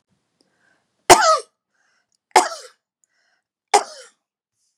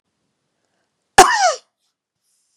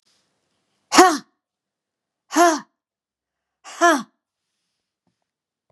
{"three_cough_length": "4.8 s", "three_cough_amplitude": 32768, "three_cough_signal_mean_std_ratio": 0.24, "cough_length": "2.6 s", "cough_amplitude": 32768, "cough_signal_mean_std_ratio": 0.26, "exhalation_length": "5.7 s", "exhalation_amplitude": 32767, "exhalation_signal_mean_std_ratio": 0.26, "survey_phase": "beta (2021-08-13 to 2022-03-07)", "age": "65+", "gender": "Female", "wearing_mask": "No", "symptom_cough_any": true, "smoker_status": "Ex-smoker", "respiratory_condition_asthma": false, "respiratory_condition_other": false, "recruitment_source": "Test and Trace", "submission_delay": "0 days", "covid_test_result": "Negative", "covid_test_method": "LFT"}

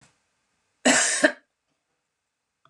{"cough_length": "2.7 s", "cough_amplitude": 20816, "cough_signal_mean_std_ratio": 0.31, "survey_phase": "beta (2021-08-13 to 2022-03-07)", "age": "65+", "gender": "Female", "wearing_mask": "No", "symptom_none": true, "smoker_status": "Never smoked", "respiratory_condition_asthma": false, "respiratory_condition_other": false, "recruitment_source": "REACT", "submission_delay": "3 days", "covid_test_result": "Negative", "covid_test_method": "RT-qPCR", "influenza_a_test_result": "Negative", "influenza_b_test_result": "Negative"}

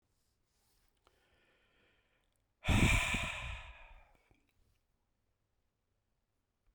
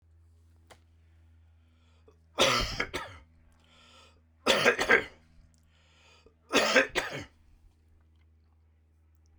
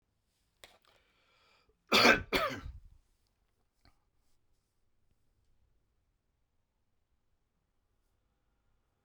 {"exhalation_length": "6.7 s", "exhalation_amplitude": 4960, "exhalation_signal_mean_std_ratio": 0.28, "three_cough_length": "9.4 s", "three_cough_amplitude": 15564, "three_cough_signal_mean_std_ratio": 0.33, "cough_length": "9.0 s", "cough_amplitude": 9079, "cough_signal_mean_std_ratio": 0.19, "survey_phase": "alpha (2021-03-01 to 2021-08-12)", "age": "65+", "gender": "Male", "wearing_mask": "No", "symptom_headache": true, "smoker_status": "Never smoked", "respiratory_condition_asthma": false, "respiratory_condition_other": false, "recruitment_source": "Test and Trace", "submission_delay": "2 days", "covid_test_result": "Positive", "covid_test_method": "RT-qPCR", "covid_ct_value": 27.0, "covid_ct_gene": "ORF1ab gene", "covid_ct_mean": 27.3, "covid_viral_load": "1100 copies/ml", "covid_viral_load_category": "Minimal viral load (< 10K copies/ml)"}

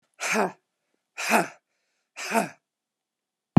{"exhalation_length": "3.6 s", "exhalation_amplitude": 26866, "exhalation_signal_mean_std_ratio": 0.31, "survey_phase": "alpha (2021-03-01 to 2021-08-12)", "age": "45-64", "gender": "Female", "wearing_mask": "No", "symptom_none": true, "smoker_status": "Never smoked", "respiratory_condition_asthma": false, "respiratory_condition_other": false, "recruitment_source": "REACT", "submission_delay": "9 days", "covid_test_result": "Negative", "covid_test_method": "RT-qPCR"}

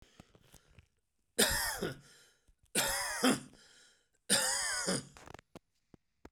{"three_cough_length": "6.3 s", "three_cough_amplitude": 7012, "three_cough_signal_mean_std_ratio": 0.45, "survey_phase": "beta (2021-08-13 to 2022-03-07)", "age": "65+", "gender": "Male", "wearing_mask": "No", "symptom_none": true, "smoker_status": "Ex-smoker", "respiratory_condition_asthma": false, "respiratory_condition_other": false, "recruitment_source": "REACT", "submission_delay": "3 days", "covid_test_result": "Negative", "covid_test_method": "RT-qPCR"}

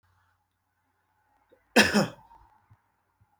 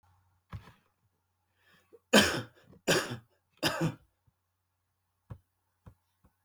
{"cough_length": "3.4 s", "cough_amplitude": 18945, "cough_signal_mean_std_ratio": 0.22, "three_cough_length": "6.4 s", "three_cough_amplitude": 14751, "three_cough_signal_mean_std_ratio": 0.26, "survey_phase": "beta (2021-08-13 to 2022-03-07)", "age": "18-44", "gender": "Male", "wearing_mask": "No", "symptom_sore_throat": true, "smoker_status": "Never smoked", "respiratory_condition_asthma": false, "respiratory_condition_other": false, "recruitment_source": "REACT", "submission_delay": "11 days", "covid_test_result": "Negative", "covid_test_method": "RT-qPCR", "influenza_a_test_result": "Negative", "influenza_b_test_result": "Negative"}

